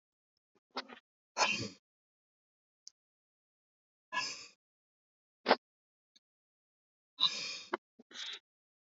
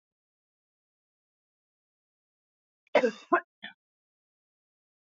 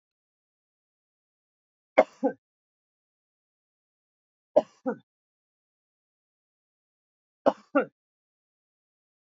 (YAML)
exhalation_length: 9.0 s
exhalation_amplitude: 8450
exhalation_signal_mean_std_ratio: 0.25
cough_length: 5.0 s
cough_amplitude: 11537
cough_signal_mean_std_ratio: 0.17
three_cough_length: 9.2 s
three_cough_amplitude: 20376
three_cough_signal_mean_std_ratio: 0.14
survey_phase: alpha (2021-03-01 to 2021-08-12)
age: 65+
gender: Female
wearing_mask: 'No'
symptom_none: true
smoker_status: Never smoked
respiratory_condition_asthma: false
respiratory_condition_other: false
recruitment_source: REACT
submission_delay: 3 days
covid_test_result: Negative
covid_test_method: RT-qPCR